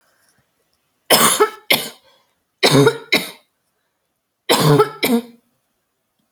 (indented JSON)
{
  "three_cough_length": "6.3 s",
  "three_cough_amplitude": 32768,
  "three_cough_signal_mean_std_ratio": 0.39,
  "survey_phase": "alpha (2021-03-01 to 2021-08-12)",
  "age": "18-44",
  "gender": "Female",
  "wearing_mask": "No",
  "symptom_cough_any": true,
  "smoker_status": "Never smoked",
  "respiratory_condition_asthma": false,
  "respiratory_condition_other": false,
  "recruitment_source": "REACT",
  "submission_delay": "4 days",
  "covid_test_result": "Negative",
  "covid_test_method": "RT-qPCR"
}